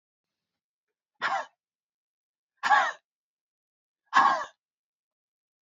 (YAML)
exhalation_length: 5.6 s
exhalation_amplitude: 14624
exhalation_signal_mean_std_ratio: 0.27
survey_phase: beta (2021-08-13 to 2022-03-07)
age: 45-64
gender: Female
wearing_mask: 'No'
symptom_none: true
smoker_status: Ex-smoker
respiratory_condition_asthma: false
respiratory_condition_other: false
recruitment_source: REACT
submission_delay: 2 days
covid_test_result: Negative
covid_test_method: RT-qPCR
influenza_a_test_result: Negative
influenza_b_test_result: Negative